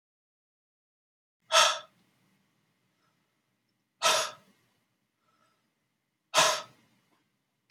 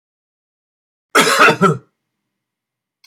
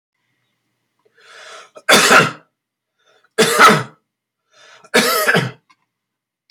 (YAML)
exhalation_length: 7.7 s
exhalation_amplitude: 13400
exhalation_signal_mean_std_ratio: 0.24
cough_length: 3.1 s
cough_amplitude: 31429
cough_signal_mean_std_ratio: 0.34
three_cough_length: 6.5 s
three_cough_amplitude: 32768
three_cough_signal_mean_std_ratio: 0.37
survey_phase: alpha (2021-03-01 to 2021-08-12)
age: 45-64
gender: Male
wearing_mask: 'No'
symptom_change_to_sense_of_smell_or_taste: true
symptom_onset: 12 days
smoker_status: Never smoked
respiratory_condition_asthma: true
respiratory_condition_other: false
recruitment_source: REACT
submission_delay: 6 days
covid_test_result: Negative
covid_test_method: RT-qPCR